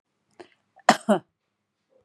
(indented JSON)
{
  "cough_length": "2.0 s",
  "cough_amplitude": 30836,
  "cough_signal_mean_std_ratio": 0.21,
  "survey_phase": "beta (2021-08-13 to 2022-03-07)",
  "age": "45-64",
  "gender": "Female",
  "wearing_mask": "No",
  "symptom_runny_or_blocked_nose": true,
  "symptom_fatigue": true,
  "symptom_onset": "12 days",
  "smoker_status": "Ex-smoker",
  "respiratory_condition_asthma": false,
  "respiratory_condition_other": false,
  "recruitment_source": "REACT",
  "submission_delay": "1 day",
  "covid_test_result": "Negative",
  "covid_test_method": "RT-qPCR",
  "influenza_a_test_result": "Negative",
  "influenza_b_test_result": "Negative"
}